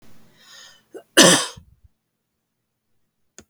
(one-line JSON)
{"cough_length": "3.5 s", "cough_amplitude": 32768, "cough_signal_mean_std_ratio": 0.23, "survey_phase": "beta (2021-08-13 to 2022-03-07)", "age": "45-64", "gender": "Female", "wearing_mask": "No", "symptom_none": true, "smoker_status": "Never smoked", "respiratory_condition_asthma": false, "respiratory_condition_other": false, "recruitment_source": "REACT", "submission_delay": "1 day", "covid_test_result": "Negative", "covid_test_method": "RT-qPCR", "influenza_a_test_result": "Negative", "influenza_b_test_result": "Negative"}